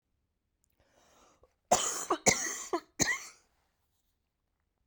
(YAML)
cough_length: 4.9 s
cough_amplitude: 14087
cough_signal_mean_std_ratio: 0.32
survey_phase: beta (2021-08-13 to 2022-03-07)
age: 18-44
gender: Female
wearing_mask: 'No'
symptom_cough_any: true
symptom_sore_throat: true
smoker_status: Never smoked
respiratory_condition_asthma: false
respiratory_condition_other: false
recruitment_source: Test and Trace
submission_delay: 2 days
covid_test_result: Negative
covid_test_method: RT-qPCR